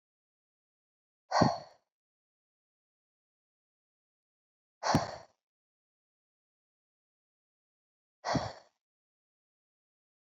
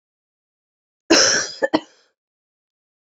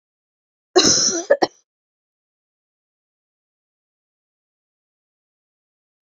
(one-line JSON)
{"exhalation_length": "10.2 s", "exhalation_amplitude": 10505, "exhalation_signal_mean_std_ratio": 0.2, "three_cough_length": "3.1 s", "three_cough_amplitude": 30167, "three_cough_signal_mean_std_ratio": 0.31, "cough_length": "6.1 s", "cough_amplitude": 28423, "cough_signal_mean_std_ratio": 0.23, "survey_phase": "beta (2021-08-13 to 2022-03-07)", "age": "18-44", "gender": "Female", "wearing_mask": "No", "symptom_none": true, "smoker_status": "Ex-smoker", "respiratory_condition_asthma": false, "respiratory_condition_other": false, "recruitment_source": "REACT", "submission_delay": "2 days", "covid_test_result": "Negative", "covid_test_method": "RT-qPCR", "influenza_a_test_result": "Negative", "influenza_b_test_result": "Negative"}